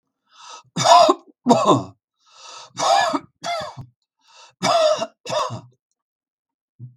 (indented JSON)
{
  "three_cough_length": "7.0 s",
  "three_cough_amplitude": 32767,
  "three_cough_signal_mean_std_ratio": 0.43,
  "survey_phase": "beta (2021-08-13 to 2022-03-07)",
  "age": "65+",
  "gender": "Male",
  "wearing_mask": "No",
  "symptom_none": true,
  "smoker_status": "Never smoked",
  "respiratory_condition_asthma": false,
  "respiratory_condition_other": false,
  "recruitment_source": "REACT",
  "submission_delay": "7 days",
  "covid_test_result": "Negative",
  "covid_test_method": "RT-qPCR"
}